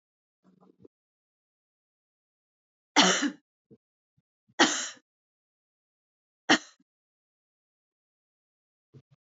{"three_cough_length": "9.4 s", "three_cough_amplitude": 16319, "three_cough_signal_mean_std_ratio": 0.19, "survey_phase": "beta (2021-08-13 to 2022-03-07)", "age": "45-64", "gender": "Female", "wearing_mask": "No", "symptom_none": true, "smoker_status": "Never smoked", "respiratory_condition_asthma": false, "respiratory_condition_other": false, "recruitment_source": "REACT", "submission_delay": "1 day", "covid_test_result": "Negative", "covid_test_method": "RT-qPCR", "influenza_a_test_result": "Negative", "influenza_b_test_result": "Negative"}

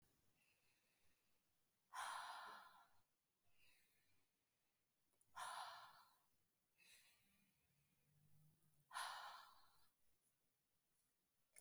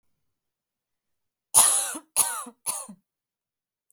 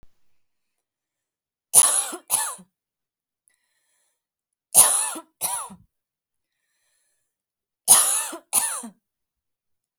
{"exhalation_length": "11.6 s", "exhalation_amplitude": 390, "exhalation_signal_mean_std_ratio": 0.4, "cough_length": "3.9 s", "cough_amplitude": 29358, "cough_signal_mean_std_ratio": 0.31, "three_cough_length": "10.0 s", "three_cough_amplitude": 32768, "three_cough_signal_mean_std_ratio": 0.29, "survey_phase": "alpha (2021-03-01 to 2021-08-12)", "age": "18-44", "gender": "Female", "wearing_mask": "No", "symptom_none": true, "symptom_onset": "5 days", "smoker_status": "Never smoked", "respiratory_condition_asthma": false, "respiratory_condition_other": false, "recruitment_source": "REACT", "submission_delay": "1 day", "covid_test_result": "Negative", "covid_test_method": "RT-qPCR"}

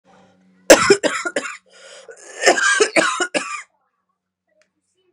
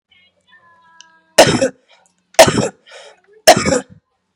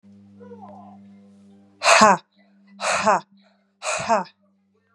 {"cough_length": "5.1 s", "cough_amplitude": 32768, "cough_signal_mean_std_ratio": 0.39, "three_cough_length": "4.4 s", "three_cough_amplitude": 32768, "three_cough_signal_mean_std_ratio": 0.32, "exhalation_length": "4.9 s", "exhalation_amplitude": 32723, "exhalation_signal_mean_std_ratio": 0.35, "survey_phase": "beta (2021-08-13 to 2022-03-07)", "age": "18-44", "gender": "Female", "wearing_mask": "No", "symptom_cough_any": true, "symptom_runny_or_blocked_nose": true, "symptom_sore_throat": true, "symptom_abdominal_pain": true, "symptom_diarrhoea": true, "symptom_fatigue": true, "symptom_fever_high_temperature": true, "symptom_headache": true, "smoker_status": "Ex-smoker", "respiratory_condition_asthma": false, "respiratory_condition_other": false, "recruitment_source": "Test and Trace", "submission_delay": "2 days", "covid_test_result": "Positive", "covid_test_method": "ePCR"}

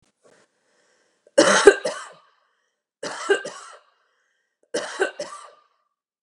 {"three_cough_length": "6.2 s", "three_cough_amplitude": 32767, "three_cough_signal_mean_std_ratio": 0.27, "survey_phase": "beta (2021-08-13 to 2022-03-07)", "age": "45-64", "gender": "Female", "wearing_mask": "No", "symptom_none": true, "smoker_status": "Ex-smoker", "respiratory_condition_asthma": false, "respiratory_condition_other": false, "recruitment_source": "REACT", "submission_delay": "1 day", "covid_test_result": "Negative", "covid_test_method": "RT-qPCR"}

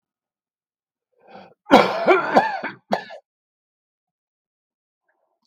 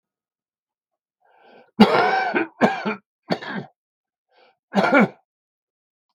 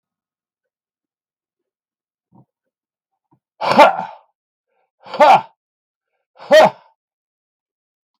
{"cough_length": "5.5 s", "cough_amplitude": 32768, "cough_signal_mean_std_ratio": 0.29, "three_cough_length": "6.1 s", "three_cough_amplitude": 32768, "three_cough_signal_mean_std_ratio": 0.36, "exhalation_length": "8.2 s", "exhalation_amplitude": 32768, "exhalation_signal_mean_std_ratio": 0.25, "survey_phase": "beta (2021-08-13 to 2022-03-07)", "age": "65+", "gender": "Male", "wearing_mask": "No", "symptom_cough_any": true, "symptom_onset": "9 days", "smoker_status": "Never smoked", "respiratory_condition_asthma": false, "respiratory_condition_other": false, "recruitment_source": "REACT", "submission_delay": "1 day", "covid_test_result": "Negative", "covid_test_method": "RT-qPCR"}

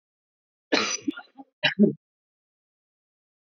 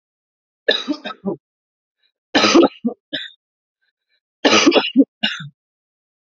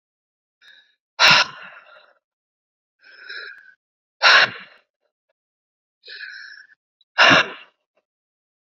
{"cough_length": "3.4 s", "cough_amplitude": 15552, "cough_signal_mean_std_ratio": 0.28, "three_cough_length": "6.4 s", "three_cough_amplitude": 30941, "three_cough_signal_mean_std_ratio": 0.36, "exhalation_length": "8.8 s", "exhalation_amplitude": 29406, "exhalation_signal_mean_std_ratio": 0.27, "survey_phase": "beta (2021-08-13 to 2022-03-07)", "age": "18-44", "gender": "Female", "wearing_mask": "No", "symptom_cough_any": true, "symptom_runny_or_blocked_nose": true, "symptom_sore_throat": true, "symptom_diarrhoea": true, "symptom_fatigue": true, "symptom_headache": true, "symptom_onset": "8 days", "smoker_status": "Ex-smoker", "respiratory_condition_asthma": false, "respiratory_condition_other": false, "recruitment_source": "Test and Trace", "submission_delay": "1 day", "covid_test_result": "Negative", "covid_test_method": "RT-qPCR"}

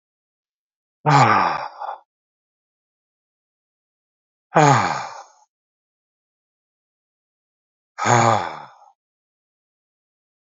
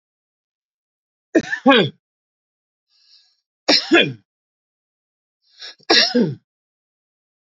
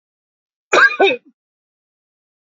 {"exhalation_length": "10.4 s", "exhalation_amplitude": 29400, "exhalation_signal_mean_std_ratio": 0.3, "three_cough_length": "7.4 s", "three_cough_amplitude": 29840, "three_cough_signal_mean_std_ratio": 0.3, "cough_length": "2.5 s", "cough_amplitude": 27017, "cough_signal_mean_std_ratio": 0.31, "survey_phase": "beta (2021-08-13 to 2022-03-07)", "age": "65+", "gender": "Male", "wearing_mask": "No", "symptom_none": true, "smoker_status": "Never smoked", "respiratory_condition_asthma": false, "respiratory_condition_other": false, "recruitment_source": "REACT", "submission_delay": "12 days", "covid_test_result": "Negative", "covid_test_method": "RT-qPCR"}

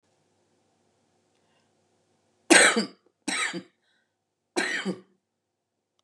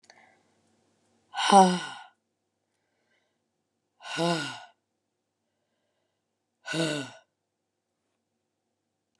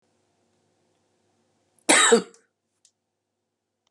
{"three_cough_length": "6.0 s", "three_cough_amplitude": 23512, "three_cough_signal_mean_std_ratio": 0.26, "exhalation_length": "9.2 s", "exhalation_amplitude": 21220, "exhalation_signal_mean_std_ratio": 0.24, "cough_length": "3.9 s", "cough_amplitude": 29387, "cough_signal_mean_std_ratio": 0.23, "survey_phase": "beta (2021-08-13 to 2022-03-07)", "age": "45-64", "gender": "Female", "wearing_mask": "No", "symptom_cough_any": true, "symptom_runny_or_blocked_nose": true, "symptom_sore_throat": true, "symptom_fatigue": true, "symptom_headache": true, "symptom_onset": "4 days", "smoker_status": "Never smoked", "respiratory_condition_asthma": true, "respiratory_condition_other": false, "recruitment_source": "Test and Trace", "submission_delay": "1 day", "covid_test_result": "Negative", "covid_test_method": "RT-qPCR"}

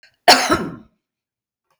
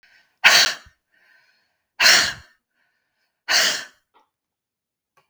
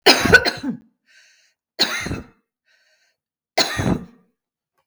{"cough_length": "1.8 s", "cough_amplitude": 32768, "cough_signal_mean_std_ratio": 0.32, "exhalation_length": "5.3 s", "exhalation_amplitude": 32768, "exhalation_signal_mean_std_ratio": 0.32, "three_cough_length": "4.9 s", "three_cough_amplitude": 32768, "three_cough_signal_mean_std_ratio": 0.35, "survey_phase": "beta (2021-08-13 to 2022-03-07)", "age": "65+", "gender": "Female", "wearing_mask": "No", "symptom_none": true, "smoker_status": "Never smoked", "respiratory_condition_asthma": false, "respiratory_condition_other": false, "recruitment_source": "REACT", "submission_delay": "4 days", "covid_test_result": "Negative", "covid_test_method": "RT-qPCR"}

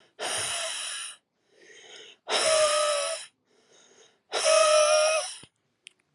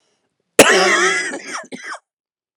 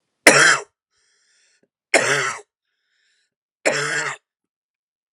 {"exhalation_length": "6.1 s", "exhalation_amplitude": 12001, "exhalation_signal_mean_std_ratio": 0.56, "cough_length": "2.6 s", "cough_amplitude": 32768, "cough_signal_mean_std_ratio": 0.45, "three_cough_length": "5.1 s", "three_cough_amplitude": 32768, "three_cough_signal_mean_std_ratio": 0.33, "survey_phase": "alpha (2021-03-01 to 2021-08-12)", "age": "18-44", "gender": "Female", "wearing_mask": "No", "symptom_cough_any": true, "symptom_new_continuous_cough": true, "symptom_shortness_of_breath": true, "symptom_fatigue": true, "symptom_fever_high_temperature": true, "symptom_headache": true, "symptom_change_to_sense_of_smell_or_taste": true, "symptom_loss_of_taste": true, "symptom_onset": "4 days", "smoker_status": "Current smoker (11 or more cigarettes per day)", "respiratory_condition_asthma": false, "respiratory_condition_other": false, "recruitment_source": "Test and Trace", "submission_delay": "3 days", "covid_test_result": "Positive", "covid_test_method": "RT-qPCR"}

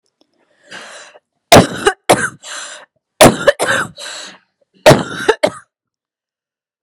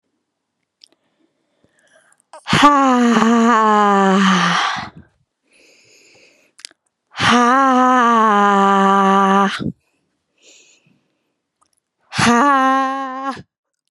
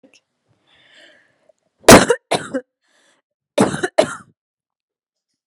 {"three_cough_length": "6.8 s", "three_cough_amplitude": 32768, "three_cough_signal_mean_std_ratio": 0.34, "exhalation_length": "13.9 s", "exhalation_amplitude": 32768, "exhalation_signal_mean_std_ratio": 0.56, "cough_length": "5.5 s", "cough_amplitude": 32768, "cough_signal_mean_std_ratio": 0.24, "survey_phase": "beta (2021-08-13 to 2022-03-07)", "age": "18-44", "gender": "Female", "wearing_mask": "No", "symptom_cough_any": true, "symptom_onset": "8 days", "smoker_status": "Never smoked", "respiratory_condition_asthma": false, "respiratory_condition_other": false, "recruitment_source": "REACT", "submission_delay": "1 day", "covid_test_result": "Negative", "covid_test_method": "RT-qPCR"}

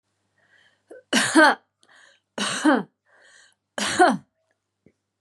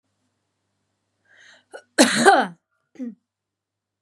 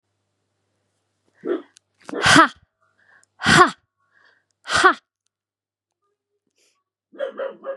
{"three_cough_length": "5.2 s", "three_cough_amplitude": 24943, "three_cough_signal_mean_std_ratio": 0.35, "cough_length": "4.0 s", "cough_amplitude": 32767, "cough_signal_mean_std_ratio": 0.27, "exhalation_length": "7.8 s", "exhalation_amplitude": 32643, "exhalation_signal_mean_std_ratio": 0.28, "survey_phase": "beta (2021-08-13 to 2022-03-07)", "age": "18-44", "gender": "Female", "wearing_mask": "No", "symptom_sore_throat": true, "symptom_fatigue": true, "symptom_change_to_sense_of_smell_or_taste": true, "symptom_other": true, "smoker_status": "Ex-smoker", "respiratory_condition_asthma": false, "respiratory_condition_other": false, "recruitment_source": "Test and Trace", "submission_delay": "1 day", "covid_test_result": "Positive", "covid_test_method": "RT-qPCR", "covid_ct_value": 28.1, "covid_ct_gene": "ORF1ab gene"}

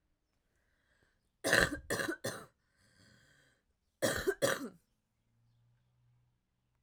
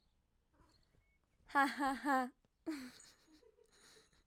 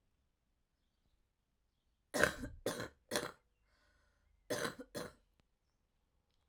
{"three_cough_length": "6.8 s", "three_cough_amplitude": 10259, "three_cough_signal_mean_std_ratio": 0.31, "exhalation_length": "4.3 s", "exhalation_amplitude": 3135, "exhalation_signal_mean_std_ratio": 0.34, "cough_length": "6.5 s", "cough_amplitude": 7663, "cough_signal_mean_std_ratio": 0.29, "survey_phase": "alpha (2021-03-01 to 2021-08-12)", "age": "18-44", "gender": "Female", "wearing_mask": "No", "symptom_cough_any": true, "symptom_fatigue": true, "symptom_headache": true, "symptom_change_to_sense_of_smell_or_taste": true, "symptom_loss_of_taste": true, "symptom_onset": "6 days", "smoker_status": "Never smoked", "respiratory_condition_asthma": false, "respiratory_condition_other": false, "recruitment_source": "Test and Trace", "submission_delay": "2 days", "covid_test_result": "Positive", "covid_test_method": "RT-qPCR", "covid_ct_value": 18.2, "covid_ct_gene": "ORF1ab gene", "covid_ct_mean": 19.2, "covid_viral_load": "510000 copies/ml", "covid_viral_load_category": "Low viral load (10K-1M copies/ml)"}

